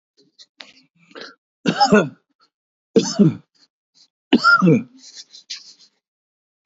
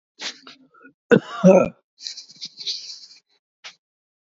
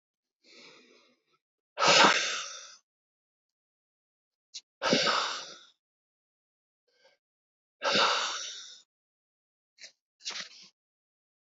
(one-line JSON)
{"three_cough_length": "6.7 s", "three_cough_amplitude": 26601, "three_cough_signal_mean_std_ratio": 0.33, "cough_length": "4.4 s", "cough_amplitude": 28408, "cough_signal_mean_std_ratio": 0.27, "exhalation_length": "11.4 s", "exhalation_amplitude": 14813, "exhalation_signal_mean_std_ratio": 0.32, "survey_phase": "beta (2021-08-13 to 2022-03-07)", "age": "45-64", "gender": "Male", "wearing_mask": "No", "symptom_runny_or_blocked_nose": true, "symptom_shortness_of_breath": true, "smoker_status": "Current smoker (e-cigarettes or vapes only)", "respiratory_condition_asthma": false, "respiratory_condition_other": false, "recruitment_source": "REACT", "submission_delay": "2 days", "covid_test_result": "Negative", "covid_test_method": "RT-qPCR", "influenza_a_test_result": "Negative", "influenza_b_test_result": "Negative"}